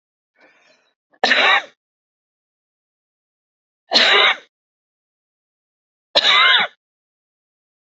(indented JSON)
{
  "three_cough_length": "7.9 s",
  "three_cough_amplitude": 29403,
  "three_cough_signal_mean_std_ratio": 0.33,
  "survey_phase": "beta (2021-08-13 to 2022-03-07)",
  "age": "45-64",
  "gender": "Female",
  "wearing_mask": "No",
  "symptom_none": true,
  "smoker_status": "Never smoked",
  "respiratory_condition_asthma": false,
  "respiratory_condition_other": false,
  "recruitment_source": "REACT",
  "submission_delay": "2 days",
  "covid_test_result": "Negative",
  "covid_test_method": "RT-qPCR",
  "influenza_a_test_result": "Negative",
  "influenza_b_test_result": "Negative"
}